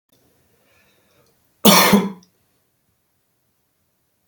{"cough_length": "4.3 s", "cough_amplitude": 32768, "cough_signal_mean_std_ratio": 0.25, "survey_phase": "beta (2021-08-13 to 2022-03-07)", "age": "45-64", "gender": "Male", "wearing_mask": "No", "symptom_none": true, "smoker_status": "Never smoked", "respiratory_condition_asthma": false, "respiratory_condition_other": false, "recruitment_source": "REACT", "submission_delay": "2 days", "covid_test_result": "Negative", "covid_test_method": "RT-qPCR", "influenza_a_test_result": "Negative", "influenza_b_test_result": "Negative"}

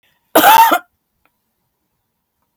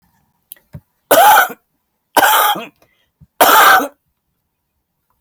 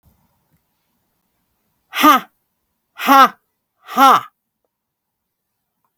{"cough_length": "2.6 s", "cough_amplitude": 32768, "cough_signal_mean_std_ratio": 0.35, "three_cough_length": "5.2 s", "three_cough_amplitude": 32768, "three_cough_signal_mean_std_ratio": 0.43, "exhalation_length": "6.0 s", "exhalation_amplitude": 32768, "exhalation_signal_mean_std_ratio": 0.28, "survey_phase": "beta (2021-08-13 to 2022-03-07)", "age": "65+", "gender": "Female", "wearing_mask": "No", "symptom_sore_throat": true, "symptom_fatigue": true, "symptom_loss_of_taste": true, "symptom_onset": "13 days", "smoker_status": "Ex-smoker", "respiratory_condition_asthma": false, "respiratory_condition_other": false, "recruitment_source": "REACT", "submission_delay": "1 day", "covid_test_result": "Negative", "covid_test_method": "RT-qPCR", "influenza_a_test_result": "Negative", "influenza_b_test_result": "Negative"}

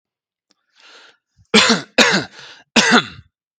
{"three_cough_length": "3.6 s", "three_cough_amplitude": 32768, "three_cough_signal_mean_std_ratio": 0.38, "survey_phase": "beta (2021-08-13 to 2022-03-07)", "age": "45-64", "gender": "Male", "wearing_mask": "No", "symptom_none": true, "smoker_status": "Never smoked", "respiratory_condition_asthma": false, "respiratory_condition_other": false, "recruitment_source": "REACT", "submission_delay": "3 days", "covid_test_result": "Negative", "covid_test_method": "RT-qPCR", "influenza_a_test_result": "Negative", "influenza_b_test_result": "Negative"}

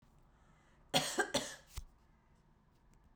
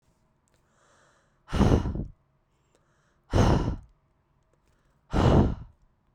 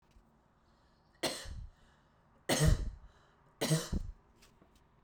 {"cough_length": "3.2 s", "cough_amplitude": 4971, "cough_signal_mean_std_ratio": 0.34, "exhalation_length": "6.1 s", "exhalation_amplitude": 14030, "exhalation_signal_mean_std_ratio": 0.38, "three_cough_length": "5.0 s", "three_cough_amplitude": 5439, "three_cough_signal_mean_std_ratio": 0.38, "survey_phase": "beta (2021-08-13 to 2022-03-07)", "age": "18-44", "gender": "Female", "wearing_mask": "No", "symptom_headache": true, "symptom_other": true, "symptom_onset": "12 days", "smoker_status": "Current smoker (11 or more cigarettes per day)", "respiratory_condition_asthma": false, "respiratory_condition_other": false, "recruitment_source": "REACT", "submission_delay": "1 day", "covid_test_result": "Negative", "covid_test_method": "RT-qPCR"}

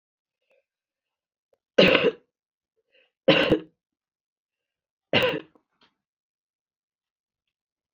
{"three_cough_length": "7.9 s", "three_cough_amplitude": 28328, "three_cough_signal_mean_std_ratio": 0.25, "survey_phase": "beta (2021-08-13 to 2022-03-07)", "age": "45-64", "gender": "Female", "wearing_mask": "No", "symptom_runny_or_blocked_nose": true, "symptom_headache": true, "symptom_change_to_sense_of_smell_or_taste": true, "smoker_status": "Current smoker (11 or more cigarettes per day)", "respiratory_condition_asthma": false, "respiratory_condition_other": false, "recruitment_source": "REACT", "submission_delay": "2 days", "covid_test_result": "Negative", "covid_test_method": "RT-qPCR"}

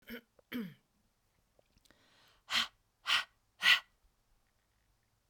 {"exhalation_length": "5.3 s", "exhalation_amplitude": 7065, "exhalation_signal_mean_std_ratio": 0.26, "survey_phase": "beta (2021-08-13 to 2022-03-07)", "age": "45-64", "gender": "Female", "wearing_mask": "No", "symptom_none": true, "smoker_status": "Ex-smoker", "respiratory_condition_asthma": false, "respiratory_condition_other": false, "recruitment_source": "REACT", "submission_delay": "2 days", "covid_test_result": "Negative", "covid_test_method": "RT-qPCR"}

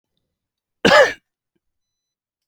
{"cough_length": "2.5 s", "cough_amplitude": 30007, "cough_signal_mean_std_ratio": 0.26, "survey_phase": "alpha (2021-03-01 to 2021-08-12)", "age": "45-64", "gender": "Male", "wearing_mask": "No", "symptom_none": true, "smoker_status": "Ex-smoker", "respiratory_condition_asthma": false, "respiratory_condition_other": false, "recruitment_source": "REACT", "submission_delay": "2 days", "covid_test_result": "Negative", "covid_test_method": "RT-qPCR"}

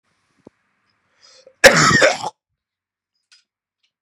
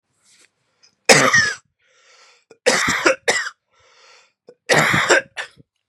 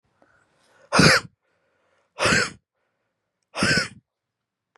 {"cough_length": "4.0 s", "cough_amplitude": 32768, "cough_signal_mean_std_ratio": 0.28, "three_cough_length": "5.9 s", "three_cough_amplitude": 32768, "three_cough_signal_mean_std_ratio": 0.42, "exhalation_length": "4.8 s", "exhalation_amplitude": 26475, "exhalation_signal_mean_std_ratio": 0.33, "survey_phase": "beta (2021-08-13 to 2022-03-07)", "age": "18-44", "gender": "Male", "wearing_mask": "No", "symptom_runny_or_blocked_nose": true, "symptom_sore_throat": true, "symptom_fatigue": true, "symptom_fever_high_temperature": true, "symptom_change_to_sense_of_smell_or_taste": true, "symptom_loss_of_taste": true, "symptom_onset": "4 days", "smoker_status": "Current smoker (1 to 10 cigarettes per day)", "respiratory_condition_asthma": false, "respiratory_condition_other": false, "recruitment_source": "Test and Trace", "submission_delay": "3 days", "covid_test_result": "Positive", "covid_test_method": "LAMP"}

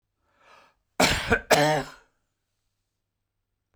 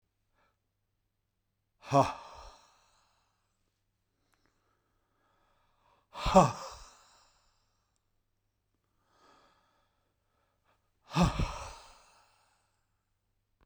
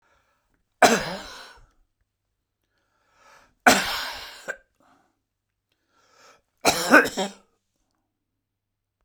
{"cough_length": "3.8 s", "cough_amplitude": 25674, "cough_signal_mean_std_ratio": 0.34, "exhalation_length": "13.7 s", "exhalation_amplitude": 12073, "exhalation_signal_mean_std_ratio": 0.2, "three_cough_length": "9.0 s", "three_cough_amplitude": 32767, "three_cough_signal_mean_std_ratio": 0.26, "survey_phase": "beta (2021-08-13 to 2022-03-07)", "age": "65+", "gender": "Male", "wearing_mask": "No", "symptom_shortness_of_breath": true, "symptom_headache": true, "symptom_other": true, "smoker_status": "Ex-smoker", "respiratory_condition_asthma": false, "respiratory_condition_other": false, "recruitment_source": "Test and Trace", "submission_delay": "1 day", "covid_test_result": "Positive", "covid_test_method": "RT-qPCR", "covid_ct_value": 35.5, "covid_ct_gene": "ORF1ab gene"}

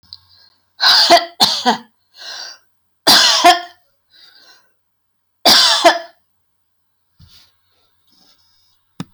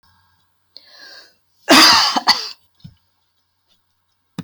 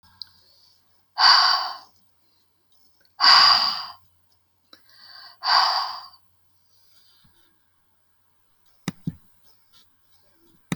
{"three_cough_length": "9.1 s", "three_cough_amplitude": 32214, "three_cough_signal_mean_std_ratio": 0.37, "cough_length": "4.4 s", "cough_amplitude": 29605, "cough_signal_mean_std_ratio": 0.31, "exhalation_length": "10.8 s", "exhalation_amplitude": 27496, "exhalation_signal_mean_std_ratio": 0.31, "survey_phase": "alpha (2021-03-01 to 2021-08-12)", "age": "65+", "gender": "Female", "wearing_mask": "No", "symptom_none": true, "smoker_status": "Never smoked", "respiratory_condition_asthma": false, "respiratory_condition_other": false, "recruitment_source": "REACT", "submission_delay": "1 day", "covid_test_result": "Negative", "covid_test_method": "RT-qPCR"}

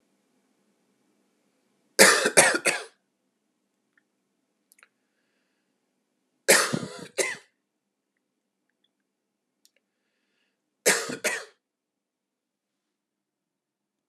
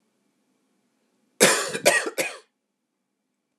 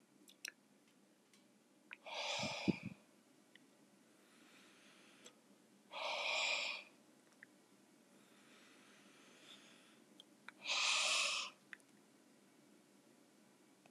{"three_cough_length": "14.1 s", "three_cough_amplitude": 30946, "three_cough_signal_mean_std_ratio": 0.23, "cough_length": "3.6 s", "cough_amplitude": 30352, "cough_signal_mean_std_ratio": 0.31, "exhalation_length": "13.9 s", "exhalation_amplitude": 2934, "exhalation_signal_mean_std_ratio": 0.4, "survey_phase": "beta (2021-08-13 to 2022-03-07)", "age": "45-64", "gender": "Male", "wearing_mask": "No", "symptom_none": true, "smoker_status": "Never smoked", "respiratory_condition_asthma": false, "respiratory_condition_other": false, "recruitment_source": "REACT", "submission_delay": "2 days", "covid_test_result": "Negative", "covid_test_method": "RT-qPCR", "influenza_a_test_result": "Unknown/Void", "influenza_b_test_result": "Unknown/Void"}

